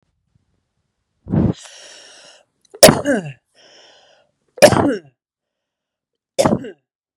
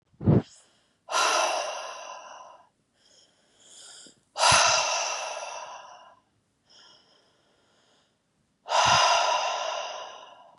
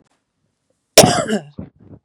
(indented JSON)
{
  "three_cough_length": "7.2 s",
  "three_cough_amplitude": 32768,
  "three_cough_signal_mean_std_ratio": 0.28,
  "exhalation_length": "10.6 s",
  "exhalation_amplitude": 13714,
  "exhalation_signal_mean_std_ratio": 0.46,
  "cough_length": "2.0 s",
  "cough_amplitude": 32768,
  "cough_signal_mean_std_ratio": 0.3,
  "survey_phase": "beta (2021-08-13 to 2022-03-07)",
  "age": "45-64",
  "gender": "Female",
  "wearing_mask": "No",
  "symptom_none": true,
  "smoker_status": "Ex-smoker",
  "respiratory_condition_asthma": false,
  "respiratory_condition_other": false,
  "recruitment_source": "REACT",
  "submission_delay": "3 days",
  "covid_test_result": "Negative",
  "covid_test_method": "RT-qPCR",
  "influenza_a_test_result": "Negative",
  "influenza_b_test_result": "Negative"
}